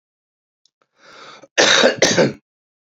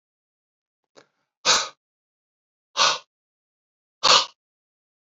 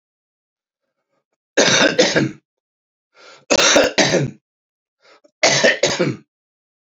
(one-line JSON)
{"cough_length": "2.9 s", "cough_amplitude": 30901, "cough_signal_mean_std_ratio": 0.39, "exhalation_length": "5.0 s", "exhalation_amplitude": 27680, "exhalation_signal_mean_std_ratio": 0.26, "three_cough_length": "7.0 s", "three_cough_amplitude": 32768, "three_cough_signal_mean_std_ratio": 0.44, "survey_phase": "beta (2021-08-13 to 2022-03-07)", "age": "65+", "gender": "Male", "wearing_mask": "No", "symptom_new_continuous_cough": true, "symptom_shortness_of_breath": true, "symptom_fatigue": true, "symptom_fever_high_temperature": true, "symptom_onset": "8 days", "smoker_status": "Ex-smoker", "respiratory_condition_asthma": false, "respiratory_condition_other": false, "recruitment_source": "Test and Trace", "submission_delay": "1 day", "covid_test_result": "Negative", "covid_test_method": "RT-qPCR"}